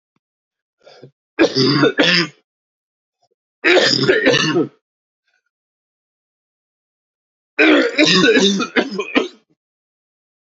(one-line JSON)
{"three_cough_length": "10.4 s", "three_cough_amplitude": 32731, "three_cough_signal_mean_std_ratio": 0.46, "survey_phase": "beta (2021-08-13 to 2022-03-07)", "age": "45-64", "gender": "Male", "wearing_mask": "No", "symptom_cough_any": true, "symptom_shortness_of_breath": true, "symptom_sore_throat": true, "symptom_onset": "6 days", "smoker_status": "Never smoked", "respiratory_condition_asthma": false, "respiratory_condition_other": false, "recruitment_source": "Test and Trace", "submission_delay": "2 days", "covid_test_result": "Positive", "covid_test_method": "ePCR"}